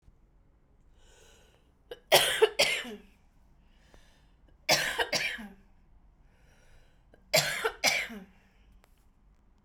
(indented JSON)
{
  "three_cough_length": "9.6 s",
  "three_cough_amplitude": 17031,
  "three_cough_signal_mean_std_ratio": 0.34,
  "survey_phase": "beta (2021-08-13 to 2022-03-07)",
  "age": "45-64",
  "gender": "Female",
  "wearing_mask": "No",
  "symptom_cough_any": true,
  "symptom_onset": "10 days",
  "smoker_status": "Never smoked",
  "respiratory_condition_asthma": false,
  "respiratory_condition_other": false,
  "recruitment_source": "REACT",
  "submission_delay": "1 day",
  "covid_test_result": "Negative",
  "covid_test_method": "RT-qPCR",
  "influenza_a_test_result": "Unknown/Void",
  "influenza_b_test_result": "Unknown/Void"
}